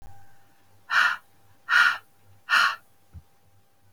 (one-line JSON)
{"exhalation_length": "3.9 s", "exhalation_amplitude": 16013, "exhalation_signal_mean_std_ratio": 0.39, "survey_phase": "beta (2021-08-13 to 2022-03-07)", "age": "65+", "gender": "Female", "wearing_mask": "No", "symptom_none": true, "smoker_status": "Never smoked", "respiratory_condition_asthma": false, "respiratory_condition_other": false, "recruitment_source": "REACT", "submission_delay": "1 day", "covid_test_result": "Negative", "covid_test_method": "RT-qPCR"}